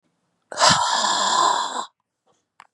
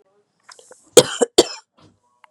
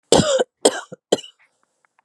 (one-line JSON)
{"exhalation_length": "2.7 s", "exhalation_amplitude": 29883, "exhalation_signal_mean_std_ratio": 0.57, "cough_length": "2.3 s", "cough_amplitude": 32768, "cough_signal_mean_std_ratio": 0.22, "three_cough_length": "2.0 s", "three_cough_amplitude": 32767, "three_cough_signal_mean_std_ratio": 0.36, "survey_phase": "beta (2021-08-13 to 2022-03-07)", "age": "45-64", "gender": "Female", "wearing_mask": "No", "symptom_cough_any": true, "symptom_runny_or_blocked_nose": true, "symptom_sore_throat": true, "symptom_fatigue": true, "symptom_headache": true, "symptom_onset": "6 days", "smoker_status": "Never smoked", "respiratory_condition_asthma": false, "respiratory_condition_other": false, "recruitment_source": "Test and Trace", "submission_delay": "2 days", "covid_test_result": "Positive", "covid_test_method": "RT-qPCR", "covid_ct_value": 25.2, "covid_ct_gene": "ORF1ab gene"}